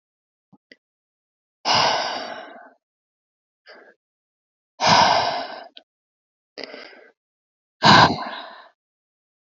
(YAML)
exhalation_length: 9.6 s
exhalation_amplitude: 28994
exhalation_signal_mean_std_ratio: 0.32
survey_phase: alpha (2021-03-01 to 2021-08-12)
age: 18-44
gender: Female
wearing_mask: 'No'
symptom_none: true
smoker_status: Current smoker (1 to 10 cigarettes per day)
respiratory_condition_asthma: false
respiratory_condition_other: false
recruitment_source: REACT
submission_delay: 2 days
covid_test_result: Negative
covid_test_method: RT-qPCR